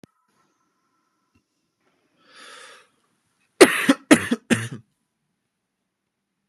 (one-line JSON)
{"cough_length": "6.5 s", "cough_amplitude": 32768, "cough_signal_mean_std_ratio": 0.2, "survey_phase": "beta (2021-08-13 to 2022-03-07)", "age": "18-44", "gender": "Male", "wearing_mask": "No", "symptom_headache": true, "smoker_status": "Never smoked", "respiratory_condition_asthma": false, "respiratory_condition_other": false, "recruitment_source": "Test and Trace", "submission_delay": "2 days", "covid_test_result": "Positive", "covid_test_method": "RT-qPCR", "covid_ct_value": 29.2, "covid_ct_gene": "ORF1ab gene"}